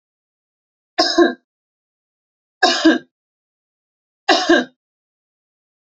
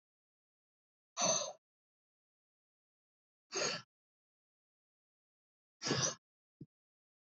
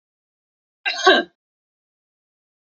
{"three_cough_length": "5.9 s", "three_cough_amplitude": 30348, "three_cough_signal_mean_std_ratio": 0.31, "exhalation_length": "7.3 s", "exhalation_amplitude": 2979, "exhalation_signal_mean_std_ratio": 0.27, "cough_length": "2.7 s", "cough_amplitude": 29605, "cough_signal_mean_std_ratio": 0.24, "survey_phase": "alpha (2021-03-01 to 2021-08-12)", "age": "18-44", "gender": "Female", "wearing_mask": "No", "symptom_none": true, "smoker_status": "Never smoked", "respiratory_condition_asthma": false, "respiratory_condition_other": false, "recruitment_source": "REACT", "submission_delay": "1 day", "covid_test_result": "Negative", "covid_test_method": "RT-qPCR"}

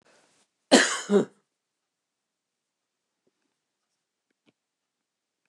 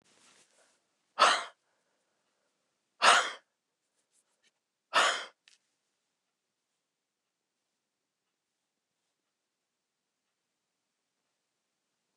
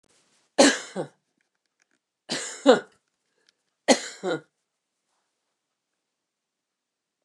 {"cough_length": "5.5 s", "cough_amplitude": 23834, "cough_signal_mean_std_ratio": 0.19, "exhalation_length": "12.2 s", "exhalation_amplitude": 15616, "exhalation_signal_mean_std_ratio": 0.19, "three_cough_length": "7.2 s", "three_cough_amplitude": 27971, "three_cough_signal_mean_std_ratio": 0.22, "survey_phase": "beta (2021-08-13 to 2022-03-07)", "age": "65+", "gender": "Female", "wearing_mask": "No", "symptom_none": true, "smoker_status": "Ex-smoker", "respiratory_condition_asthma": false, "respiratory_condition_other": false, "recruitment_source": "REACT", "submission_delay": "2 days", "covid_test_result": "Negative", "covid_test_method": "RT-qPCR", "influenza_a_test_result": "Negative", "influenza_b_test_result": "Negative"}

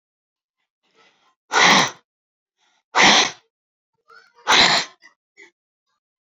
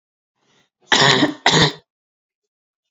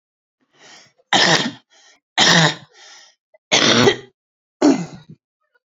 {"exhalation_length": "6.2 s", "exhalation_amplitude": 31481, "exhalation_signal_mean_std_ratio": 0.33, "cough_length": "2.9 s", "cough_amplitude": 32560, "cough_signal_mean_std_ratio": 0.38, "three_cough_length": "5.7 s", "three_cough_amplitude": 31093, "three_cough_signal_mean_std_ratio": 0.41, "survey_phase": "beta (2021-08-13 to 2022-03-07)", "age": "18-44", "gender": "Female", "wearing_mask": "No", "symptom_cough_any": true, "symptom_runny_or_blocked_nose": true, "symptom_shortness_of_breath": true, "symptom_sore_throat": true, "symptom_abdominal_pain": true, "symptom_fatigue": true, "symptom_headache": true, "symptom_change_to_sense_of_smell_or_taste": true, "symptom_loss_of_taste": true, "symptom_onset": "5 days", "smoker_status": "Ex-smoker", "respiratory_condition_asthma": false, "respiratory_condition_other": false, "recruitment_source": "Test and Trace", "submission_delay": "3 days", "covid_test_result": "Positive", "covid_test_method": "RT-qPCR"}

